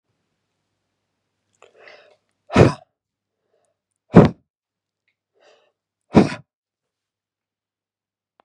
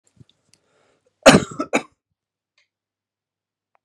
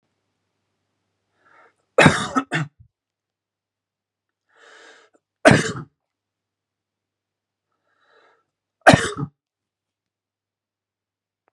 {"exhalation_length": "8.4 s", "exhalation_amplitude": 32768, "exhalation_signal_mean_std_ratio": 0.17, "cough_length": "3.8 s", "cough_amplitude": 32768, "cough_signal_mean_std_ratio": 0.18, "three_cough_length": "11.5 s", "three_cough_amplitude": 32768, "three_cough_signal_mean_std_ratio": 0.2, "survey_phase": "beta (2021-08-13 to 2022-03-07)", "age": "45-64", "gender": "Male", "wearing_mask": "No", "symptom_none": true, "smoker_status": "Ex-smoker", "respiratory_condition_asthma": false, "respiratory_condition_other": false, "recruitment_source": "REACT", "submission_delay": "1 day", "covid_test_result": "Negative", "covid_test_method": "RT-qPCR", "influenza_a_test_result": "Negative", "influenza_b_test_result": "Negative"}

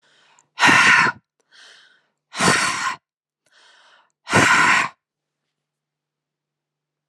{"exhalation_length": "7.1 s", "exhalation_amplitude": 30804, "exhalation_signal_mean_std_ratio": 0.39, "survey_phase": "alpha (2021-03-01 to 2021-08-12)", "age": "45-64", "gender": "Female", "wearing_mask": "No", "symptom_none": true, "smoker_status": "Never smoked", "respiratory_condition_asthma": false, "respiratory_condition_other": false, "recruitment_source": "REACT", "submission_delay": "2 days", "covid_test_result": "Negative", "covid_test_method": "RT-qPCR"}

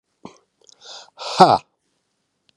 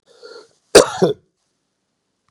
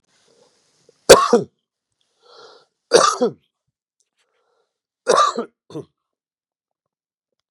{"exhalation_length": "2.6 s", "exhalation_amplitude": 32768, "exhalation_signal_mean_std_ratio": 0.24, "cough_length": "2.3 s", "cough_amplitude": 32768, "cough_signal_mean_std_ratio": 0.25, "three_cough_length": "7.5 s", "three_cough_amplitude": 32768, "three_cough_signal_mean_std_ratio": 0.25, "survey_phase": "beta (2021-08-13 to 2022-03-07)", "age": "45-64", "gender": "Male", "wearing_mask": "No", "symptom_cough_any": true, "symptom_other": true, "symptom_onset": "5 days", "smoker_status": "Ex-smoker", "respiratory_condition_asthma": false, "respiratory_condition_other": false, "recruitment_source": "Test and Trace", "submission_delay": "2 days", "covid_test_result": "Positive", "covid_test_method": "RT-qPCR", "covid_ct_value": 18.0, "covid_ct_gene": "ORF1ab gene", "covid_ct_mean": 18.3, "covid_viral_load": "1000000 copies/ml", "covid_viral_load_category": "High viral load (>1M copies/ml)"}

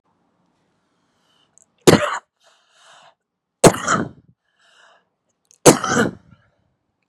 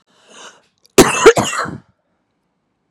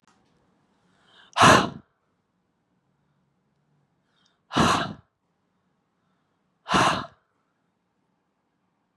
{"three_cough_length": "7.1 s", "three_cough_amplitude": 32768, "three_cough_signal_mean_std_ratio": 0.25, "cough_length": "2.9 s", "cough_amplitude": 32768, "cough_signal_mean_std_ratio": 0.32, "exhalation_length": "9.0 s", "exhalation_amplitude": 24417, "exhalation_signal_mean_std_ratio": 0.25, "survey_phase": "beta (2021-08-13 to 2022-03-07)", "age": "45-64", "gender": "Female", "wearing_mask": "No", "symptom_cough_any": true, "smoker_status": "Current smoker (11 or more cigarettes per day)", "respiratory_condition_asthma": false, "respiratory_condition_other": false, "recruitment_source": "REACT", "submission_delay": "0 days", "covid_test_result": "Negative", "covid_test_method": "RT-qPCR", "influenza_a_test_result": "Negative", "influenza_b_test_result": "Negative"}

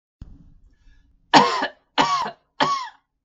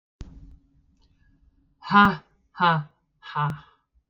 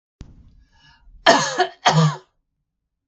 {"three_cough_length": "3.2 s", "three_cough_amplitude": 32766, "three_cough_signal_mean_std_ratio": 0.39, "exhalation_length": "4.1 s", "exhalation_amplitude": 19093, "exhalation_signal_mean_std_ratio": 0.32, "cough_length": "3.1 s", "cough_amplitude": 32768, "cough_signal_mean_std_ratio": 0.37, "survey_phase": "beta (2021-08-13 to 2022-03-07)", "age": "45-64", "gender": "Female", "wearing_mask": "No", "symptom_none": true, "smoker_status": "Ex-smoker", "respiratory_condition_asthma": false, "respiratory_condition_other": false, "recruitment_source": "REACT", "submission_delay": "5 days", "covid_test_result": "Negative", "covid_test_method": "RT-qPCR"}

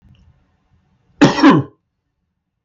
{"cough_length": "2.6 s", "cough_amplitude": 32768, "cough_signal_mean_std_ratio": 0.31, "survey_phase": "beta (2021-08-13 to 2022-03-07)", "age": "45-64", "gender": "Male", "wearing_mask": "No", "symptom_none": true, "smoker_status": "Never smoked", "respiratory_condition_asthma": false, "respiratory_condition_other": false, "recruitment_source": "REACT", "submission_delay": "4 days", "covid_test_result": "Negative", "covid_test_method": "RT-qPCR"}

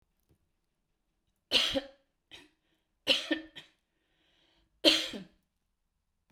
{"three_cough_length": "6.3 s", "three_cough_amplitude": 15366, "three_cough_signal_mean_std_ratio": 0.27, "survey_phase": "beta (2021-08-13 to 2022-03-07)", "age": "65+", "gender": "Female", "wearing_mask": "No", "symptom_none": true, "smoker_status": "Never smoked", "respiratory_condition_asthma": false, "respiratory_condition_other": false, "recruitment_source": "REACT", "submission_delay": "1 day", "covid_test_result": "Negative", "covid_test_method": "RT-qPCR", "influenza_a_test_result": "Negative", "influenza_b_test_result": "Negative"}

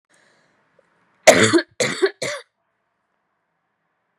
{"three_cough_length": "4.2 s", "three_cough_amplitude": 32768, "three_cough_signal_mean_std_ratio": 0.28, "survey_phase": "beta (2021-08-13 to 2022-03-07)", "age": "18-44", "gender": "Female", "wearing_mask": "No", "symptom_cough_any": true, "symptom_new_continuous_cough": true, "symptom_runny_or_blocked_nose": true, "symptom_sore_throat": true, "symptom_fatigue": true, "symptom_fever_high_temperature": true, "symptom_headache": true, "symptom_change_to_sense_of_smell_or_taste": true, "symptom_loss_of_taste": true, "symptom_onset": "6 days", "smoker_status": "Never smoked", "respiratory_condition_asthma": false, "respiratory_condition_other": false, "recruitment_source": "Test and Trace", "submission_delay": "1 day", "covid_test_result": "Positive", "covid_test_method": "RT-qPCR", "covid_ct_value": 22.3, "covid_ct_gene": "ORF1ab gene"}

